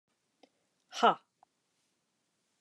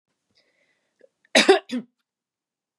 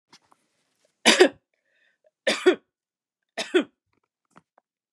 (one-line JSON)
{"exhalation_length": "2.6 s", "exhalation_amplitude": 8545, "exhalation_signal_mean_std_ratio": 0.18, "cough_length": "2.8 s", "cough_amplitude": 28735, "cough_signal_mean_std_ratio": 0.24, "three_cough_length": "4.9 s", "three_cough_amplitude": 26807, "three_cough_signal_mean_std_ratio": 0.25, "survey_phase": "beta (2021-08-13 to 2022-03-07)", "age": "45-64", "gender": "Female", "wearing_mask": "No", "symptom_none": true, "smoker_status": "Never smoked", "respiratory_condition_asthma": false, "respiratory_condition_other": false, "recruitment_source": "REACT", "submission_delay": "3 days", "covid_test_result": "Negative", "covid_test_method": "RT-qPCR", "influenza_a_test_result": "Negative", "influenza_b_test_result": "Negative"}